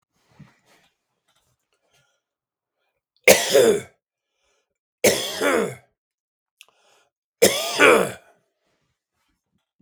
{"three_cough_length": "9.8 s", "three_cough_amplitude": 32768, "three_cough_signal_mean_std_ratio": 0.3, "survey_phase": "beta (2021-08-13 to 2022-03-07)", "age": "45-64", "gender": "Male", "wearing_mask": "No", "symptom_none": true, "smoker_status": "Ex-smoker", "respiratory_condition_asthma": false, "respiratory_condition_other": false, "recruitment_source": "REACT", "submission_delay": "1 day", "covid_test_result": "Negative", "covid_test_method": "RT-qPCR"}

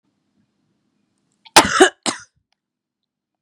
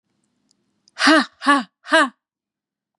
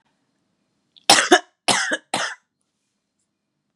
{"cough_length": "3.4 s", "cough_amplitude": 32768, "cough_signal_mean_std_ratio": 0.22, "exhalation_length": "3.0 s", "exhalation_amplitude": 30103, "exhalation_signal_mean_std_ratio": 0.35, "three_cough_length": "3.8 s", "three_cough_amplitude": 32768, "three_cough_signal_mean_std_ratio": 0.29, "survey_phase": "beta (2021-08-13 to 2022-03-07)", "age": "45-64", "gender": "Female", "wearing_mask": "No", "symptom_cough_any": true, "symptom_runny_or_blocked_nose": true, "symptom_change_to_sense_of_smell_or_taste": true, "symptom_other": true, "smoker_status": "Never smoked", "respiratory_condition_asthma": false, "respiratory_condition_other": false, "recruitment_source": "Test and Trace", "submission_delay": "2 days", "covid_test_result": "Positive", "covid_test_method": "LFT"}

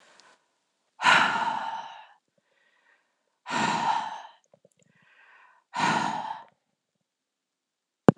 {"exhalation_length": "8.2 s", "exhalation_amplitude": 26028, "exhalation_signal_mean_std_ratio": 0.35, "survey_phase": "beta (2021-08-13 to 2022-03-07)", "age": "45-64", "gender": "Female", "wearing_mask": "No", "symptom_none": true, "smoker_status": "Never smoked", "respiratory_condition_asthma": false, "respiratory_condition_other": false, "recruitment_source": "REACT", "submission_delay": "1 day", "covid_test_result": "Negative", "covid_test_method": "RT-qPCR"}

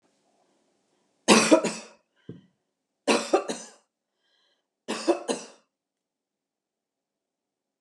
{"three_cough_length": "7.8 s", "three_cough_amplitude": 22263, "three_cough_signal_mean_std_ratio": 0.27, "survey_phase": "alpha (2021-03-01 to 2021-08-12)", "age": "45-64", "gender": "Female", "wearing_mask": "No", "symptom_none": true, "smoker_status": "Never smoked", "respiratory_condition_asthma": false, "respiratory_condition_other": false, "recruitment_source": "REACT", "submission_delay": "5 days", "covid_test_result": "Negative", "covid_test_method": "RT-qPCR"}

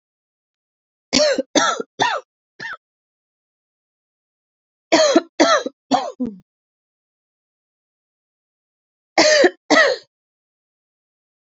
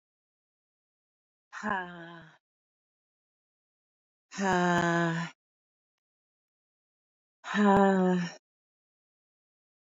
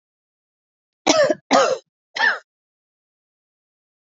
{"three_cough_length": "11.5 s", "three_cough_amplitude": 32379, "three_cough_signal_mean_std_ratio": 0.34, "exhalation_length": "9.9 s", "exhalation_amplitude": 9198, "exhalation_signal_mean_std_ratio": 0.36, "cough_length": "4.0 s", "cough_amplitude": 27504, "cough_signal_mean_std_ratio": 0.34, "survey_phase": "beta (2021-08-13 to 2022-03-07)", "age": "45-64", "gender": "Female", "wearing_mask": "No", "symptom_cough_any": true, "symptom_shortness_of_breath": true, "symptom_sore_throat": true, "symptom_abdominal_pain": true, "symptom_fatigue": true, "symptom_fever_high_temperature": true, "symptom_headache": true, "symptom_onset": "4 days", "smoker_status": "Ex-smoker", "respiratory_condition_asthma": false, "respiratory_condition_other": false, "recruitment_source": "Test and Trace", "submission_delay": "1 day", "covid_test_result": "Positive", "covid_test_method": "RT-qPCR", "covid_ct_value": 21.6, "covid_ct_gene": "ORF1ab gene"}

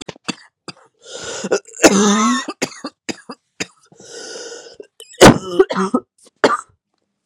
{"three_cough_length": "7.3 s", "three_cough_amplitude": 32768, "three_cough_signal_mean_std_ratio": 0.37, "survey_phase": "beta (2021-08-13 to 2022-03-07)", "age": "18-44", "gender": "Female", "wearing_mask": "No", "symptom_cough_any": true, "symptom_runny_or_blocked_nose": true, "symptom_shortness_of_breath": true, "symptom_headache": true, "symptom_change_to_sense_of_smell_or_taste": true, "symptom_other": true, "symptom_onset": "3 days", "smoker_status": "Ex-smoker", "respiratory_condition_asthma": true, "respiratory_condition_other": false, "recruitment_source": "Test and Trace", "submission_delay": "1 day", "covid_test_result": "Positive", "covid_test_method": "RT-qPCR", "covid_ct_value": 22.6, "covid_ct_gene": "ORF1ab gene"}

